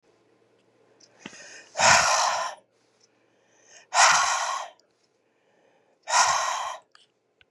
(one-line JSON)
{"exhalation_length": "7.5 s", "exhalation_amplitude": 21701, "exhalation_signal_mean_std_ratio": 0.41, "survey_phase": "beta (2021-08-13 to 2022-03-07)", "age": "65+", "gender": "Female", "wearing_mask": "No", "symptom_cough_any": true, "symptom_runny_or_blocked_nose": true, "symptom_shortness_of_breath": true, "symptom_fatigue": true, "symptom_headache": true, "symptom_other": true, "symptom_onset": "3 days", "smoker_status": "Ex-smoker", "respiratory_condition_asthma": false, "respiratory_condition_other": false, "recruitment_source": "Test and Trace", "submission_delay": "1 day", "covid_test_result": "Positive", "covid_test_method": "ePCR"}